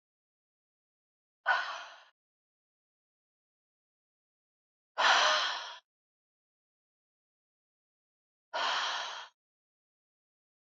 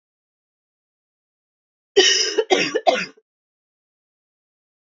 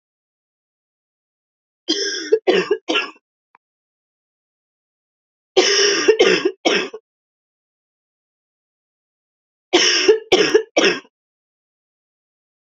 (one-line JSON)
{"exhalation_length": "10.7 s", "exhalation_amplitude": 8121, "exhalation_signal_mean_std_ratio": 0.29, "cough_length": "4.9 s", "cough_amplitude": 28493, "cough_signal_mean_std_ratio": 0.31, "three_cough_length": "12.6 s", "three_cough_amplitude": 32590, "three_cough_signal_mean_std_ratio": 0.37, "survey_phase": "beta (2021-08-13 to 2022-03-07)", "age": "45-64", "gender": "Female", "wearing_mask": "No", "symptom_cough_any": true, "symptom_runny_or_blocked_nose": true, "symptom_onset": "2 days", "smoker_status": "Prefer not to say", "respiratory_condition_asthma": false, "respiratory_condition_other": false, "recruitment_source": "Test and Trace", "submission_delay": "1 day", "covid_test_result": "Positive", "covid_test_method": "RT-qPCR", "covid_ct_value": 13.0, "covid_ct_gene": "S gene"}